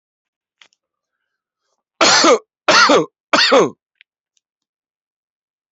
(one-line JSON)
{"cough_length": "5.7 s", "cough_amplitude": 31207, "cough_signal_mean_std_ratio": 0.37, "survey_phase": "beta (2021-08-13 to 2022-03-07)", "age": "18-44", "gender": "Male", "wearing_mask": "Yes", "symptom_none": true, "smoker_status": "Ex-smoker", "respiratory_condition_asthma": false, "respiratory_condition_other": false, "recruitment_source": "REACT", "submission_delay": "1 day", "covid_test_result": "Negative", "covid_test_method": "RT-qPCR"}